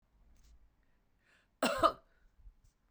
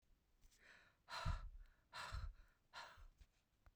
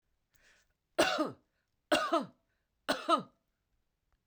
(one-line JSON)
{"cough_length": "2.9 s", "cough_amplitude": 7146, "cough_signal_mean_std_ratio": 0.25, "exhalation_length": "3.8 s", "exhalation_amplitude": 781, "exhalation_signal_mean_std_ratio": 0.47, "three_cough_length": "4.3 s", "three_cough_amplitude": 6093, "three_cough_signal_mean_std_ratio": 0.35, "survey_phase": "beta (2021-08-13 to 2022-03-07)", "age": "45-64", "gender": "Female", "wearing_mask": "No", "symptom_none": true, "symptom_onset": "13 days", "smoker_status": "Never smoked", "respiratory_condition_asthma": false, "respiratory_condition_other": false, "recruitment_source": "REACT", "submission_delay": "4 days", "covid_test_result": "Negative", "covid_test_method": "RT-qPCR", "influenza_a_test_result": "Negative", "influenza_b_test_result": "Negative"}